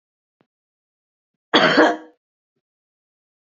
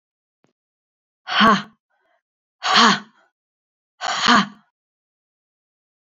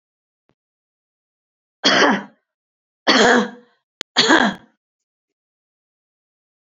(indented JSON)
{
  "cough_length": "3.5 s",
  "cough_amplitude": 31818,
  "cough_signal_mean_std_ratio": 0.27,
  "exhalation_length": "6.1 s",
  "exhalation_amplitude": 28020,
  "exhalation_signal_mean_std_ratio": 0.32,
  "three_cough_length": "6.7 s",
  "three_cough_amplitude": 32767,
  "three_cough_signal_mean_std_ratio": 0.33,
  "survey_phase": "beta (2021-08-13 to 2022-03-07)",
  "age": "45-64",
  "gender": "Female",
  "wearing_mask": "No",
  "symptom_runny_or_blocked_nose": true,
  "symptom_change_to_sense_of_smell_or_taste": true,
  "smoker_status": "Never smoked",
  "respiratory_condition_asthma": false,
  "respiratory_condition_other": false,
  "recruitment_source": "Test and Trace",
  "submission_delay": "2 days",
  "covid_test_result": "Positive",
  "covid_test_method": "RT-qPCR",
  "covid_ct_value": 20.2,
  "covid_ct_gene": "ORF1ab gene",
  "covid_ct_mean": 20.5,
  "covid_viral_load": "190000 copies/ml",
  "covid_viral_load_category": "Low viral load (10K-1M copies/ml)"
}